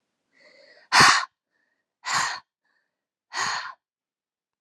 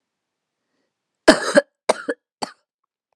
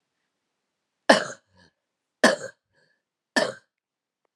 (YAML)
exhalation_length: 4.6 s
exhalation_amplitude: 25633
exhalation_signal_mean_std_ratio: 0.3
cough_length: 3.2 s
cough_amplitude: 32768
cough_signal_mean_std_ratio: 0.23
three_cough_length: 4.4 s
three_cough_amplitude: 31090
three_cough_signal_mean_std_ratio: 0.22
survey_phase: beta (2021-08-13 to 2022-03-07)
age: 18-44
gender: Female
wearing_mask: 'No'
symptom_new_continuous_cough: true
symptom_runny_or_blocked_nose: true
symptom_shortness_of_breath: true
symptom_sore_throat: true
symptom_fatigue: true
symptom_headache: true
smoker_status: Never smoked
respiratory_condition_asthma: false
respiratory_condition_other: false
recruitment_source: Test and Trace
submission_delay: 2 days
covid_test_result: Positive
covid_test_method: RT-qPCR
covid_ct_value: 19.6
covid_ct_gene: ORF1ab gene
covid_ct_mean: 20.0
covid_viral_load: 280000 copies/ml
covid_viral_load_category: Low viral load (10K-1M copies/ml)